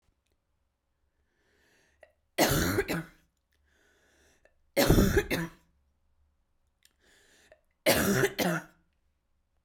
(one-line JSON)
{"three_cough_length": "9.6 s", "three_cough_amplitude": 12753, "three_cough_signal_mean_std_ratio": 0.35, "survey_phase": "beta (2021-08-13 to 2022-03-07)", "age": "18-44", "gender": "Female", "wearing_mask": "No", "symptom_cough_any": true, "symptom_new_continuous_cough": true, "symptom_runny_or_blocked_nose": true, "symptom_sore_throat": true, "symptom_fatigue": true, "symptom_headache": true, "symptom_onset": "2 days", "smoker_status": "Never smoked", "recruitment_source": "Test and Trace", "submission_delay": "1 day", "covid_test_result": "Positive", "covid_test_method": "RT-qPCR", "covid_ct_value": 31.1, "covid_ct_gene": "N gene"}